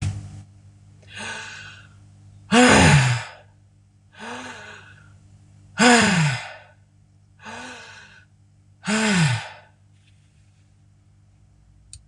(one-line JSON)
{"exhalation_length": "12.1 s", "exhalation_amplitude": 24956, "exhalation_signal_mean_std_ratio": 0.38, "survey_phase": "beta (2021-08-13 to 2022-03-07)", "age": "65+", "gender": "Female", "wearing_mask": "No", "symptom_cough_any": true, "symptom_fatigue": true, "symptom_headache": true, "symptom_onset": "4 days", "smoker_status": "Never smoked", "respiratory_condition_asthma": false, "respiratory_condition_other": false, "recruitment_source": "Test and Trace", "submission_delay": "1 day", "covid_test_result": "Positive", "covid_test_method": "ePCR"}